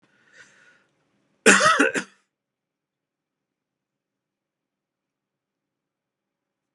{
  "cough_length": "6.7 s",
  "cough_amplitude": 29594,
  "cough_signal_mean_std_ratio": 0.21,
  "survey_phase": "beta (2021-08-13 to 2022-03-07)",
  "age": "45-64",
  "gender": "Male",
  "wearing_mask": "No",
  "symptom_cough_any": true,
  "symptom_runny_or_blocked_nose": true,
  "symptom_shortness_of_breath": true,
  "smoker_status": "Ex-smoker",
  "respiratory_condition_asthma": true,
  "respiratory_condition_other": false,
  "recruitment_source": "Test and Trace",
  "submission_delay": "1 day",
  "covid_test_result": "Negative",
  "covid_test_method": "LFT"
}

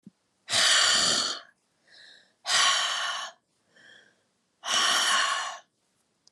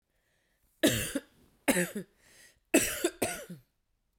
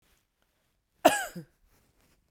{
  "exhalation_length": "6.3 s",
  "exhalation_amplitude": 11701,
  "exhalation_signal_mean_std_ratio": 0.55,
  "three_cough_length": "4.2 s",
  "three_cough_amplitude": 10996,
  "three_cough_signal_mean_std_ratio": 0.37,
  "cough_length": "2.3 s",
  "cough_amplitude": 17476,
  "cough_signal_mean_std_ratio": 0.2,
  "survey_phase": "beta (2021-08-13 to 2022-03-07)",
  "age": "18-44",
  "gender": "Female",
  "wearing_mask": "No",
  "symptom_cough_any": true,
  "symptom_runny_or_blocked_nose": true,
  "symptom_shortness_of_breath": true,
  "symptom_fatigue": true,
  "symptom_headache": true,
  "symptom_change_to_sense_of_smell_or_taste": true,
  "symptom_other": true,
  "symptom_onset": "3 days",
  "smoker_status": "Never smoked",
  "respiratory_condition_asthma": false,
  "respiratory_condition_other": false,
  "recruitment_source": "Test and Trace",
  "submission_delay": "2 days",
  "covid_test_result": "Positive",
  "covid_test_method": "RT-qPCR",
  "covid_ct_value": 24.2,
  "covid_ct_gene": "ORF1ab gene",
  "covid_ct_mean": 24.2,
  "covid_viral_load": "11000 copies/ml",
  "covid_viral_load_category": "Low viral load (10K-1M copies/ml)"
}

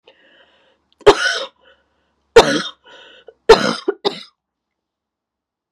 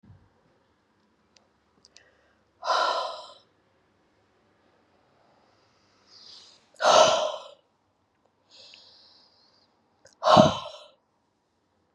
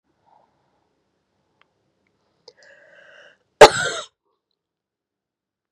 {
  "three_cough_length": "5.7 s",
  "three_cough_amplitude": 32768,
  "three_cough_signal_mean_std_ratio": 0.27,
  "exhalation_length": "11.9 s",
  "exhalation_amplitude": 30309,
  "exhalation_signal_mean_std_ratio": 0.25,
  "cough_length": "5.7 s",
  "cough_amplitude": 32768,
  "cough_signal_mean_std_ratio": 0.13,
  "survey_phase": "beta (2021-08-13 to 2022-03-07)",
  "age": "18-44",
  "gender": "Female",
  "wearing_mask": "No",
  "symptom_cough_any": true,
  "symptom_runny_or_blocked_nose": true,
  "symptom_shortness_of_breath": true,
  "symptom_sore_throat": true,
  "symptom_abdominal_pain": true,
  "symptom_headache": true,
  "symptom_change_to_sense_of_smell_or_taste": true,
  "symptom_loss_of_taste": true,
  "symptom_onset": "3 days",
  "smoker_status": "Never smoked",
  "respiratory_condition_asthma": false,
  "respiratory_condition_other": false,
  "recruitment_source": "Test and Trace",
  "submission_delay": "2 days",
  "covid_test_result": "Positive",
  "covid_test_method": "RT-qPCR",
  "covid_ct_value": 21.3,
  "covid_ct_gene": "N gene"
}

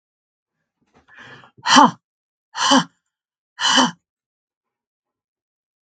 {
  "exhalation_length": "5.9 s",
  "exhalation_amplitude": 32767,
  "exhalation_signal_mean_std_ratio": 0.28,
  "survey_phase": "beta (2021-08-13 to 2022-03-07)",
  "age": "65+",
  "gender": "Female",
  "wearing_mask": "No",
  "symptom_none": true,
  "smoker_status": "Ex-smoker",
  "respiratory_condition_asthma": false,
  "respiratory_condition_other": false,
  "recruitment_source": "REACT",
  "submission_delay": "1 day",
  "covid_test_result": "Negative",
  "covid_test_method": "RT-qPCR",
  "influenza_a_test_result": "Negative",
  "influenza_b_test_result": "Negative"
}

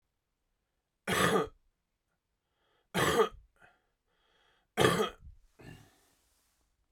{
  "three_cough_length": "6.9 s",
  "three_cough_amplitude": 11286,
  "three_cough_signal_mean_std_ratio": 0.32,
  "survey_phase": "beta (2021-08-13 to 2022-03-07)",
  "age": "18-44",
  "gender": "Male",
  "wearing_mask": "No",
  "symptom_none": true,
  "smoker_status": "Never smoked",
  "respiratory_condition_asthma": false,
  "respiratory_condition_other": false,
  "recruitment_source": "Test and Trace",
  "submission_delay": "1 day",
  "covid_test_result": "Positive",
  "covid_test_method": "RT-qPCR",
  "covid_ct_value": 35.1,
  "covid_ct_gene": "ORF1ab gene"
}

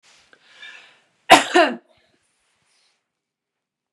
{
  "cough_length": "3.9 s",
  "cough_amplitude": 32768,
  "cough_signal_mean_std_ratio": 0.22,
  "survey_phase": "beta (2021-08-13 to 2022-03-07)",
  "age": "45-64",
  "gender": "Female",
  "wearing_mask": "No",
  "symptom_none": true,
  "smoker_status": "Never smoked",
  "respiratory_condition_asthma": false,
  "respiratory_condition_other": false,
  "recruitment_source": "REACT",
  "submission_delay": "1 day",
  "covid_test_result": "Negative",
  "covid_test_method": "RT-qPCR",
  "influenza_a_test_result": "Unknown/Void",
  "influenza_b_test_result": "Unknown/Void"
}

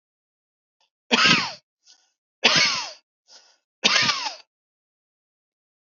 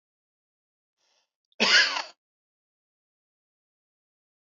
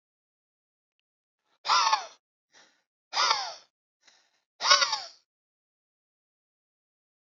{
  "three_cough_length": "5.9 s",
  "three_cough_amplitude": 30375,
  "three_cough_signal_mean_std_ratio": 0.35,
  "cough_length": "4.5 s",
  "cough_amplitude": 16132,
  "cough_signal_mean_std_ratio": 0.22,
  "exhalation_length": "7.3 s",
  "exhalation_amplitude": 21025,
  "exhalation_signal_mean_std_ratio": 0.28,
  "survey_phase": "beta (2021-08-13 to 2022-03-07)",
  "age": "18-44",
  "gender": "Male",
  "wearing_mask": "No",
  "symptom_none": true,
  "smoker_status": "Never smoked",
  "respiratory_condition_asthma": false,
  "respiratory_condition_other": false,
  "recruitment_source": "REACT",
  "submission_delay": "13 days",
  "covid_test_result": "Negative",
  "covid_test_method": "RT-qPCR",
  "influenza_a_test_result": "Negative",
  "influenza_b_test_result": "Negative"
}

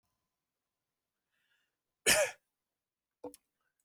{
  "cough_length": "3.8 s",
  "cough_amplitude": 10100,
  "cough_signal_mean_std_ratio": 0.2,
  "survey_phase": "alpha (2021-03-01 to 2021-08-12)",
  "age": "18-44",
  "gender": "Male",
  "wearing_mask": "No",
  "symptom_none": true,
  "smoker_status": "Never smoked",
  "respiratory_condition_asthma": false,
  "respiratory_condition_other": false,
  "recruitment_source": "REACT",
  "submission_delay": "1 day",
  "covid_test_result": "Negative",
  "covid_test_method": "RT-qPCR"
}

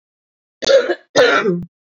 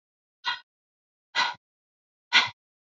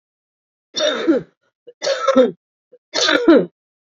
{
  "cough_length": "2.0 s",
  "cough_amplitude": 27399,
  "cough_signal_mean_std_ratio": 0.52,
  "exhalation_length": "3.0 s",
  "exhalation_amplitude": 18377,
  "exhalation_signal_mean_std_ratio": 0.26,
  "three_cough_length": "3.8 s",
  "three_cough_amplitude": 27793,
  "three_cough_signal_mean_std_ratio": 0.47,
  "survey_phase": "beta (2021-08-13 to 2022-03-07)",
  "age": "45-64",
  "gender": "Female",
  "wearing_mask": "No",
  "symptom_cough_any": true,
  "symptom_runny_or_blocked_nose": true,
  "symptom_shortness_of_breath": true,
  "symptom_fatigue": true,
  "symptom_onset": "3 days",
  "smoker_status": "Current smoker (1 to 10 cigarettes per day)",
  "respiratory_condition_asthma": false,
  "respiratory_condition_other": false,
  "recruitment_source": "Test and Trace",
  "submission_delay": "2 days",
  "covid_test_result": "Positive",
  "covid_test_method": "ePCR"
}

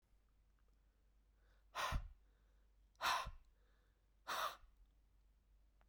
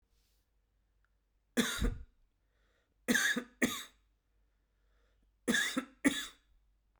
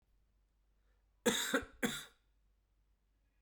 {
  "exhalation_length": "5.9 s",
  "exhalation_amplitude": 1540,
  "exhalation_signal_mean_std_ratio": 0.36,
  "three_cough_length": "7.0 s",
  "three_cough_amplitude": 6235,
  "three_cough_signal_mean_std_ratio": 0.35,
  "cough_length": "3.4 s",
  "cough_amplitude": 4647,
  "cough_signal_mean_std_ratio": 0.31,
  "survey_phase": "beta (2021-08-13 to 2022-03-07)",
  "age": "45-64",
  "gender": "Male",
  "wearing_mask": "No",
  "symptom_runny_or_blocked_nose": true,
  "symptom_headache": true,
  "symptom_change_to_sense_of_smell_or_taste": true,
  "symptom_loss_of_taste": true,
  "symptom_onset": "4 days",
  "smoker_status": "Never smoked",
  "respiratory_condition_asthma": false,
  "respiratory_condition_other": false,
  "recruitment_source": "Test and Trace",
  "submission_delay": "2 days",
  "covid_test_result": "Positive",
  "covid_test_method": "RT-qPCR",
  "covid_ct_value": 15.8,
  "covid_ct_gene": "ORF1ab gene",
  "covid_ct_mean": 16.3,
  "covid_viral_load": "4500000 copies/ml",
  "covid_viral_load_category": "High viral load (>1M copies/ml)"
}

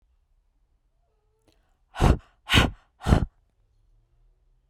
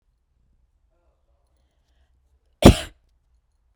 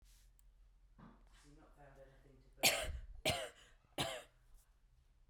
{
  "exhalation_length": "4.7 s",
  "exhalation_amplitude": 26482,
  "exhalation_signal_mean_std_ratio": 0.27,
  "cough_length": "3.8 s",
  "cough_amplitude": 32768,
  "cough_signal_mean_std_ratio": 0.14,
  "three_cough_length": "5.3 s",
  "three_cough_amplitude": 5164,
  "three_cough_signal_mean_std_ratio": 0.35,
  "survey_phase": "beta (2021-08-13 to 2022-03-07)",
  "age": "18-44",
  "gender": "Female",
  "wearing_mask": "No",
  "symptom_none": true,
  "symptom_onset": "2 days",
  "smoker_status": "Never smoked",
  "respiratory_condition_asthma": false,
  "respiratory_condition_other": false,
  "recruitment_source": "REACT",
  "submission_delay": "6 days",
  "covid_test_result": "Negative",
  "covid_test_method": "RT-qPCR"
}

